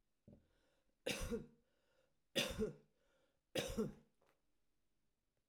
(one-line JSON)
{"three_cough_length": "5.5 s", "three_cough_amplitude": 1986, "three_cough_signal_mean_std_ratio": 0.36, "survey_phase": "alpha (2021-03-01 to 2021-08-12)", "age": "65+", "gender": "Female", "wearing_mask": "No", "symptom_none": true, "smoker_status": "Ex-smoker", "respiratory_condition_asthma": false, "respiratory_condition_other": false, "recruitment_source": "REACT", "submission_delay": "2 days", "covid_test_result": "Negative", "covid_test_method": "RT-qPCR"}